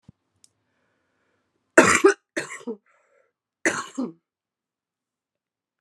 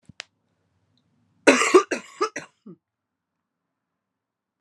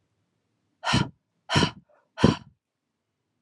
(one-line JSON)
{"three_cough_length": "5.8 s", "three_cough_amplitude": 31806, "three_cough_signal_mean_std_ratio": 0.23, "cough_length": "4.6 s", "cough_amplitude": 31411, "cough_signal_mean_std_ratio": 0.23, "exhalation_length": "3.4 s", "exhalation_amplitude": 23529, "exhalation_signal_mean_std_ratio": 0.29, "survey_phase": "alpha (2021-03-01 to 2021-08-12)", "age": "18-44", "gender": "Female", "wearing_mask": "No", "symptom_cough_any": true, "symptom_new_continuous_cough": true, "symptom_shortness_of_breath": true, "symptom_fatigue": true, "symptom_fever_high_temperature": true, "symptom_headache": true, "symptom_change_to_sense_of_smell_or_taste": true, "symptom_loss_of_taste": true, "symptom_onset": "4 days", "smoker_status": "Ex-smoker", "respiratory_condition_asthma": false, "respiratory_condition_other": false, "recruitment_source": "Test and Trace", "submission_delay": "2 days", "covid_test_result": "Positive", "covid_test_method": "RT-qPCR", "covid_ct_value": 13.9, "covid_ct_gene": "ORF1ab gene", "covid_ct_mean": 14.1, "covid_viral_load": "23000000 copies/ml", "covid_viral_load_category": "High viral load (>1M copies/ml)"}